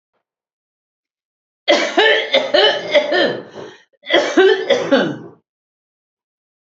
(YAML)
cough_length: 6.7 s
cough_amplitude: 32629
cough_signal_mean_std_ratio: 0.5
survey_phase: alpha (2021-03-01 to 2021-08-12)
age: 65+
gender: Female
wearing_mask: 'No'
symptom_none: true
symptom_onset: 12 days
smoker_status: Ex-smoker
respiratory_condition_asthma: false
respiratory_condition_other: false
recruitment_source: REACT
submission_delay: 3 days
covid_test_result: Negative
covid_test_method: RT-qPCR